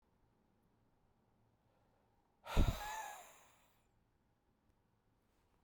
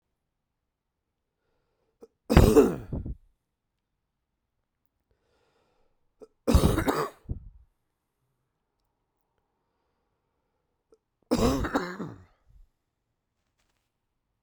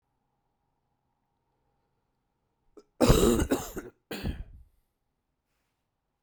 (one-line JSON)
{"exhalation_length": "5.6 s", "exhalation_amplitude": 3914, "exhalation_signal_mean_std_ratio": 0.22, "three_cough_length": "14.4 s", "three_cough_amplitude": 28380, "three_cough_signal_mean_std_ratio": 0.24, "cough_length": "6.2 s", "cough_amplitude": 16971, "cough_signal_mean_std_ratio": 0.27, "survey_phase": "beta (2021-08-13 to 2022-03-07)", "age": "18-44", "gender": "Male", "wearing_mask": "No", "symptom_cough_any": true, "symptom_runny_or_blocked_nose": true, "symptom_diarrhoea": true, "symptom_fatigue": true, "symptom_fever_high_temperature": true, "symptom_onset": "3 days", "smoker_status": "Never smoked", "respiratory_condition_asthma": false, "respiratory_condition_other": false, "recruitment_source": "Test and Trace", "submission_delay": "1 day", "covid_test_result": "Positive", "covid_test_method": "RT-qPCR", "covid_ct_value": 20.9, "covid_ct_gene": "ORF1ab gene"}